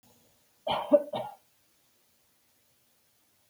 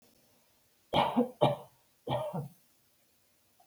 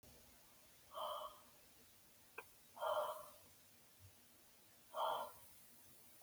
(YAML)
cough_length: 3.5 s
cough_amplitude: 12591
cough_signal_mean_std_ratio: 0.24
three_cough_length: 3.7 s
three_cough_amplitude: 9965
three_cough_signal_mean_std_ratio: 0.37
exhalation_length: 6.2 s
exhalation_amplitude: 1107
exhalation_signal_mean_std_ratio: 0.49
survey_phase: beta (2021-08-13 to 2022-03-07)
age: 45-64
gender: Female
wearing_mask: 'No'
symptom_none: true
smoker_status: Never smoked
respiratory_condition_asthma: false
respiratory_condition_other: false
recruitment_source: Test and Trace
submission_delay: 0 days
covid_test_result: Negative
covid_test_method: LFT